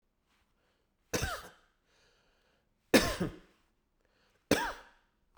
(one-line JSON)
{"cough_length": "5.4 s", "cough_amplitude": 10822, "cough_signal_mean_std_ratio": 0.26, "survey_phase": "beta (2021-08-13 to 2022-03-07)", "age": "65+", "gender": "Male", "wearing_mask": "No", "symptom_none": true, "smoker_status": "Ex-smoker", "respiratory_condition_asthma": false, "respiratory_condition_other": false, "recruitment_source": "REACT", "submission_delay": "2 days", "covid_test_result": "Negative", "covid_test_method": "RT-qPCR"}